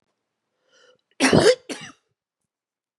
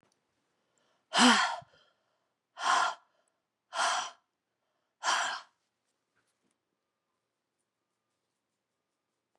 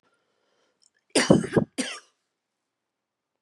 {"three_cough_length": "3.0 s", "three_cough_amplitude": 28820, "three_cough_signal_mean_std_ratio": 0.28, "exhalation_length": "9.4 s", "exhalation_amplitude": 13630, "exhalation_signal_mean_std_ratio": 0.29, "cough_length": "3.4 s", "cough_amplitude": 29157, "cough_signal_mean_std_ratio": 0.26, "survey_phase": "beta (2021-08-13 to 2022-03-07)", "age": "65+", "gender": "Female", "wearing_mask": "No", "symptom_cough_any": true, "symptom_new_continuous_cough": true, "symptom_runny_or_blocked_nose": true, "symptom_shortness_of_breath": true, "symptom_sore_throat": true, "symptom_diarrhoea": true, "symptom_fatigue": true, "symptom_fever_high_temperature": true, "symptom_headache": true, "symptom_change_to_sense_of_smell_or_taste": true, "symptom_loss_of_taste": true, "symptom_other": true, "symptom_onset": "4 days", "smoker_status": "Ex-smoker", "respiratory_condition_asthma": false, "respiratory_condition_other": false, "recruitment_source": "Test and Trace", "submission_delay": "2 days", "covid_test_result": "Positive", "covid_test_method": "RT-qPCR", "covid_ct_value": 15.2, "covid_ct_gene": "ORF1ab gene"}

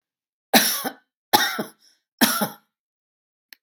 {"three_cough_length": "3.6 s", "three_cough_amplitude": 32071, "three_cough_signal_mean_std_ratio": 0.35, "survey_phase": "beta (2021-08-13 to 2022-03-07)", "age": "65+", "gender": "Female", "wearing_mask": "No", "symptom_none": true, "smoker_status": "Ex-smoker", "respiratory_condition_asthma": false, "respiratory_condition_other": false, "recruitment_source": "REACT", "submission_delay": "1 day", "covid_test_result": "Negative", "covid_test_method": "RT-qPCR", "influenza_a_test_result": "Negative", "influenza_b_test_result": "Negative"}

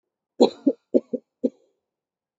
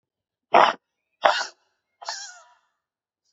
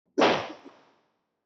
{"three_cough_length": "2.4 s", "three_cough_amplitude": 24553, "three_cough_signal_mean_std_ratio": 0.24, "exhalation_length": "3.3 s", "exhalation_amplitude": 26891, "exhalation_signal_mean_std_ratio": 0.26, "cough_length": "1.5 s", "cough_amplitude": 10967, "cough_signal_mean_std_ratio": 0.35, "survey_phase": "beta (2021-08-13 to 2022-03-07)", "age": "18-44", "gender": "Male", "wearing_mask": "No", "symptom_cough_any": true, "symptom_onset": "7 days", "smoker_status": "Current smoker (1 to 10 cigarettes per day)", "respiratory_condition_asthma": false, "respiratory_condition_other": false, "recruitment_source": "REACT", "submission_delay": "0 days", "covid_test_result": "Negative", "covid_test_method": "RT-qPCR", "influenza_a_test_result": "Negative", "influenza_b_test_result": "Negative"}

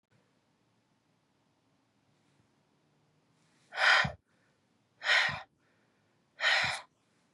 {"exhalation_length": "7.3 s", "exhalation_amplitude": 8919, "exhalation_signal_mean_std_ratio": 0.3, "survey_phase": "beta (2021-08-13 to 2022-03-07)", "age": "45-64", "gender": "Female", "wearing_mask": "No", "symptom_cough_any": true, "symptom_runny_or_blocked_nose": true, "symptom_shortness_of_breath": true, "symptom_sore_throat": true, "symptom_abdominal_pain": true, "symptom_diarrhoea": true, "symptom_fatigue": true, "symptom_fever_high_temperature": true, "symptom_headache": true, "symptom_change_to_sense_of_smell_or_taste": true, "symptom_loss_of_taste": true, "smoker_status": "Current smoker (1 to 10 cigarettes per day)", "respiratory_condition_asthma": false, "respiratory_condition_other": false, "recruitment_source": "Test and Trace", "submission_delay": "2 days", "covid_test_result": "Positive", "covid_test_method": "LFT"}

